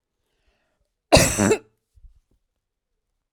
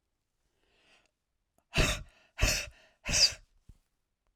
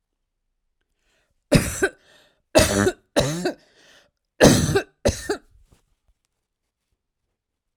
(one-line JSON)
{"cough_length": "3.3 s", "cough_amplitude": 32767, "cough_signal_mean_std_ratio": 0.27, "exhalation_length": "4.4 s", "exhalation_amplitude": 8225, "exhalation_signal_mean_std_ratio": 0.32, "three_cough_length": "7.8 s", "three_cough_amplitude": 32767, "three_cough_signal_mean_std_ratio": 0.33, "survey_phase": "alpha (2021-03-01 to 2021-08-12)", "age": "45-64", "gender": "Female", "wearing_mask": "No", "symptom_cough_any": true, "smoker_status": "Ex-smoker", "respiratory_condition_asthma": false, "respiratory_condition_other": false, "recruitment_source": "REACT", "submission_delay": "2 days", "covid_test_result": "Negative", "covid_test_method": "RT-qPCR"}